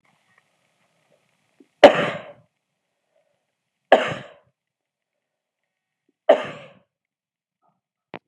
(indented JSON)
{
  "three_cough_length": "8.3 s",
  "three_cough_amplitude": 32768,
  "three_cough_signal_mean_std_ratio": 0.17,
  "survey_phase": "beta (2021-08-13 to 2022-03-07)",
  "age": "65+",
  "gender": "Male",
  "wearing_mask": "No",
  "symptom_none": true,
  "symptom_onset": "12 days",
  "smoker_status": "Never smoked",
  "respiratory_condition_asthma": false,
  "respiratory_condition_other": false,
  "recruitment_source": "REACT",
  "submission_delay": "2 days",
  "covid_test_result": "Negative",
  "covid_test_method": "RT-qPCR"
}